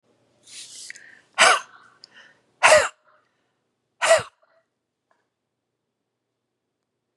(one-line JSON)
{"exhalation_length": "7.2 s", "exhalation_amplitude": 30470, "exhalation_signal_mean_std_ratio": 0.25, "survey_phase": "beta (2021-08-13 to 2022-03-07)", "age": "45-64", "gender": "Female", "wearing_mask": "No", "symptom_cough_any": true, "symptom_runny_or_blocked_nose": true, "symptom_sore_throat": true, "symptom_onset": "10 days", "smoker_status": "Ex-smoker", "respiratory_condition_asthma": false, "respiratory_condition_other": false, "recruitment_source": "REACT", "submission_delay": "6 days", "covid_test_result": "Negative", "covid_test_method": "RT-qPCR", "influenza_a_test_result": "Negative", "influenza_b_test_result": "Negative"}